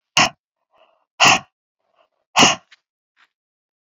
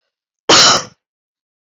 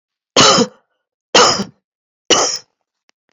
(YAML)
exhalation_length: 3.8 s
exhalation_amplitude: 31199
exhalation_signal_mean_std_ratio: 0.28
cough_length: 1.8 s
cough_amplitude: 32768
cough_signal_mean_std_ratio: 0.36
three_cough_length: 3.3 s
three_cough_amplitude: 31826
three_cough_signal_mean_std_ratio: 0.41
survey_phase: beta (2021-08-13 to 2022-03-07)
age: 45-64
gender: Female
wearing_mask: 'No'
symptom_none: true
smoker_status: Ex-smoker
respiratory_condition_asthma: false
respiratory_condition_other: false
recruitment_source: REACT
submission_delay: 1 day
covid_test_result: Negative
covid_test_method: RT-qPCR
influenza_a_test_result: Negative
influenza_b_test_result: Negative